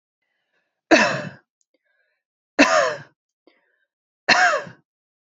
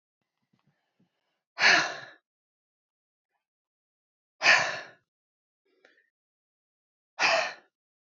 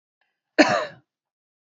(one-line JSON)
{"three_cough_length": "5.2 s", "three_cough_amplitude": 32304, "three_cough_signal_mean_std_ratio": 0.34, "exhalation_length": "8.0 s", "exhalation_amplitude": 13990, "exhalation_signal_mean_std_ratio": 0.26, "cough_length": "1.7 s", "cough_amplitude": 27485, "cough_signal_mean_std_ratio": 0.28, "survey_phase": "beta (2021-08-13 to 2022-03-07)", "age": "18-44", "gender": "Female", "wearing_mask": "No", "symptom_none": true, "smoker_status": "Never smoked", "respiratory_condition_asthma": true, "respiratory_condition_other": false, "recruitment_source": "REACT", "submission_delay": "1 day", "covid_test_result": "Negative", "covid_test_method": "RT-qPCR", "influenza_a_test_result": "Negative", "influenza_b_test_result": "Negative"}